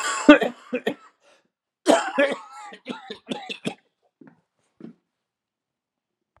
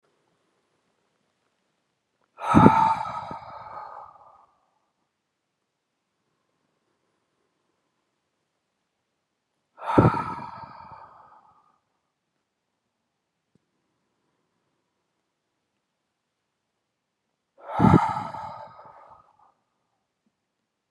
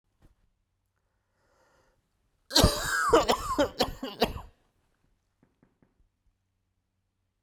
{"three_cough_length": "6.4 s", "three_cough_amplitude": 32767, "three_cough_signal_mean_std_ratio": 0.28, "exhalation_length": "20.9 s", "exhalation_amplitude": 32767, "exhalation_signal_mean_std_ratio": 0.22, "cough_length": "7.4 s", "cough_amplitude": 15166, "cough_signal_mean_std_ratio": 0.31, "survey_phase": "beta (2021-08-13 to 2022-03-07)", "age": "45-64", "gender": "Male", "wearing_mask": "No", "symptom_cough_any": true, "symptom_runny_or_blocked_nose": true, "symptom_fatigue": true, "symptom_headache": true, "symptom_change_to_sense_of_smell_or_taste": true, "symptom_loss_of_taste": true, "symptom_onset": "4 days", "smoker_status": "Never smoked", "respiratory_condition_asthma": false, "respiratory_condition_other": false, "recruitment_source": "Test and Trace", "submission_delay": "1 day", "covid_test_result": "Positive", "covid_test_method": "RT-qPCR", "covid_ct_value": 15.3, "covid_ct_gene": "ORF1ab gene"}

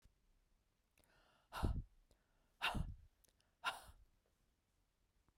{"exhalation_length": "5.4 s", "exhalation_amplitude": 1796, "exhalation_signal_mean_std_ratio": 0.31, "survey_phase": "beta (2021-08-13 to 2022-03-07)", "age": "45-64", "gender": "Female", "wearing_mask": "No", "symptom_cough_any": true, "symptom_shortness_of_breath": true, "symptom_fatigue": true, "smoker_status": "Never smoked", "respiratory_condition_asthma": false, "respiratory_condition_other": false, "recruitment_source": "Test and Trace", "submission_delay": "1 day", "covid_test_result": "Positive", "covid_test_method": "RT-qPCR", "covid_ct_value": 32.0, "covid_ct_gene": "ORF1ab gene"}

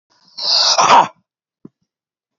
{"exhalation_length": "2.4 s", "exhalation_amplitude": 30301, "exhalation_signal_mean_std_ratio": 0.42, "survey_phase": "alpha (2021-03-01 to 2021-08-12)", "age": "45-64", "gender": "Male", "wearing_mask": "No", "symptom_cough_any": true, "symptom_fatigue": true, "symptom_fever_high_temperature": true, "symptom_change_to_sense_of_smell_or_taste": true, "symptom_onset": "5 days", "smoker_status": "Never smoked", "respiratory_condition_asthma": true, "respiratory_condition_other": false, "recruitment_source": "Test and Trace", "submission_delay": "2 days", "covid_test_result": "Positive", "covid_test_method": "RT-qPCR", "covid_ct_value": 24.9, "covid_ct_gene": "N gene"}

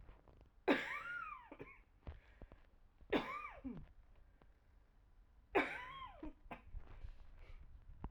{"three_cough_length": "8.1 s", "three_cough_amplitude": 3141, "three_cough_signal_mean_std_ratio": 0.45, "survey_phase": "alpha (2021-03-01 to 2021-08-12)", "age": "45-64", "gender": "Female", "wearing_mask": "Yes", "symptom_cough_any": true, "symptom_abdominal_pain": true, "symptom_fatigue": true, "symptom_headache": true, "symptom_change_to_sense_of_smell_or_taste": true, "symptom_onset": "3 days", "smoker_status": "Ex-smoker", "respiratory_condition_asthma": true, "respiratory_condition_other": false, "recruitment_source": "Test and Trace", "submission_delay": "2 days", "covid_test_result": "Positive", "covid_test_method": "RT-qPCR", "covid_ct_value": 17.4, "covid_ct_gene": "ORF1ab gene", "covid_ct_mean": 17.9, "covid_viral_load": "1400000 copies/ml", "covid_viral_load_category": "High viral load (>1M copies/ml)"}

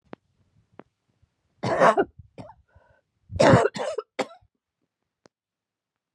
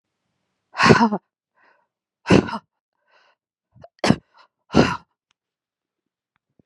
{"three_cough_length": "6.1 s", "three_cough_amplitude": 23714, "three_cough_signal_mean_std_ratio": 0.29, "exhalation_length": "6.7 s", "exhalation_amplitude": 32767, "exhalation_signal_mean_std_ratio": 0.26, "survey_phase": "beta (2021-08-13 to 2022-03-07)", "age": "45-64", "gender": "Female", "wearing_mask": "No", "symptom_cough_any": true, "symptom_runny_or_blocked_nose": true, "symptom_fatigue": true, "symptom_headache": true, "symptom_change_to_sense_of_smell_or_taste": true, "symptom_other": true, "symptom_onset": "6 days", "smoker_status": "Never smoked", "respiratory_condition_asthma": false, "respiratory_condition_other": false, "recruitment_source": "Test and Trace", "submission_delay": "2 days", "covid_test_result": "Positive", "covid_test_method": "RT-qPCR", "covid_ct_value": 23.8, "covid_ct_gene": "ORF1ab gene", "covid_ct_mean": 24.3, "covid_viral_load": "11000 copies/ml", "covid_viral_load_category": "Low viral load (10K-1M copies/ml)"}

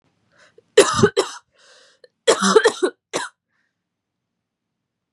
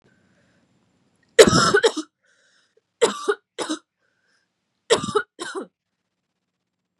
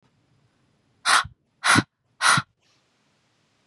{"cough_length": "5.1 s", "cough_amplitude": 32767, "cough_signal_mean_std_ratio": 0.31, "three_cough_length": "7.0 s", "three_cough_amplitude": 32768, "three_cough_signal_mean_std_ratio": 0.28, "exhalation_length": "3.7 s", "exhalation_amplitude": 21665, "exhalation_signal_mean_std_ratio": 0.31, "survey_phase": "beta (2021-08-13 to 2022-03-07)", "age": "18-44", "gender": "Female", "wearing_mask": "No", "symptom_cough_any": true, "symptom_runny_or_blocked_nose": true, "symptom_sore_throat": true, "symptom_fatigue": true, "symptom_headache": true, "smoker_status": "Never smoked", "respiratory_condition_asthma": false, "respiratory_condition_other": false, "recruitment_source": "Test and Trace", "submission_delay": "1 day", "covid_test_result": "Positive", "covid_test_method": "RT-qPCR"}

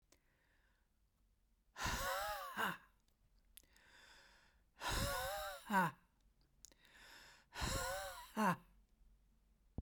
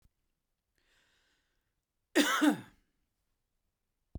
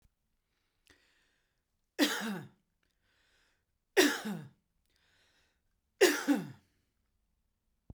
{"exhalation_length": "9.8 s", "exhalation_amplitude": 2567, "exhalation_signal_mean_std_ratio": 0.45, "cough_length": "4.2 s", "cough_amplitude": 8110, "cough_signal_mean_std_ratio": 0.25, "three_cough_length": "7.9 s", "three_cough_amplitude": 10010, "three_cough_signal_mean_std_ratio": 0.27, "survey_phase": "beta (2021-08-13 to 2022-03-07)", "age": "45-64", "gender": "Male", "wearing_mask": "No", "symptom_none": true, "smoker_status": "Never smoked", "respiratory_condition_asthma": false, "respiratory_condition_other": false, "recruitment_source": "REACT", "submission_delay": "1 day", "covid_test_result": "Negative", "covid_test_method": "RT-qPCR"}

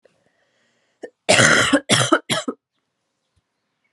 {"cough_length": "3.9 s", "cough_amplitude": 32446, "cough_signal_mean_std_ratio": 0.38, "survey_phase": "alpha (2021-03-01 to 2021-08-12)", "age": "18-44", "gender": "Female", "wearing_mask": "No", "symptom_cough_any": true, "symptom_new_continuous_cough": true, "symptom_shortness_of_breath": true, "symptom_diarrhoea": true, "symptom_headache": true, "symptom_onset": "4 days", "smoker_status": "Never smoked", "respiratory_condition_asthma": true, "respiratory_condition_other": false, "recruitment_source": "Test and Trace", "submission_delay": "1 day", "covid_test_result": "Positive", "covid_test_method": "RT-qPCR", "covid_ct_value": 14.9, "covid_ct_gene": "ORF1ab gene", "covid_ct_mean": 15.3, "covid_viral_load": "9700000 copies/ml", "covid_viral_load_category": "High viral load (>1M copies/ml)"}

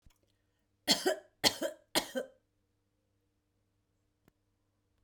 {"three_cough_length": "5.0 s", "three_cough_amplitude": 11572, "three_cough_signal_mean_std_ratio": 0.26, "survey_phase": "beta (2021-08-13 to 2022-03-07)", "age": "45-64", "gender": "Female", "wearing_mask": "No", "symptom_none": true, "smoker_status": "Never smoked", "respiratory_condition_asthma": false, "respiratory_condition_other": false, "recruitment_source": "Test and Trace", "submission_delay": "0 days", "covid_test_result": "Negative", "covid_test_method": "LFT"}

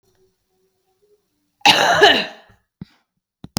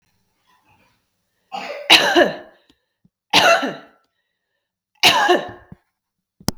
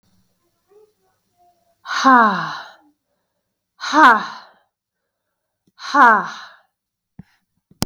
{"cough_length": "3.6 s", "cough_amplitude": 32768, "cough_signal_mean_std_ratio": 0.32, "three_cough_length": "6.6 s", "three_cough_amplitude": 32768, "three_cough_signal_mean_std_ratio": 0.35, "exhalation_length": "7.9 s", "exhalation_amplitude": 32768, "exhalation_signal_mean_std_ratio": 0.31, "survey_phase": "beta (2021-08-13 to 2022-03-07)", "age": "18-44", "gender": "Female", "wearing_mask": "No", "symptom_cough_any": true, "symptom_runny_or_blocked_nose": true, "symptom_sore_throat": true, "symptom_fever_high_temperature": true, "symptom_headache": true, "symptom_change_to_sense_of_smell_or_taste": true, "symptom_onset": "4 days", "smoker_status": "Never smoked", "respiratory_condition_asthma": false, "respiratory_condition_other": false, "recruitment_source": "Test and Trace", "submission_delay": "1 day", "covid_test_result": "Positive", "covid_test_method": "RT-qPCR", "covid_ct_value": 17.8, "covid_ct_gene": "ORF1ab gene", "covid_ct_mean": 18.3, "covid_viral_load": "980000 copies/ml", "covid_viral_load_category": "Low viral load (10K-1M copies/ml)"}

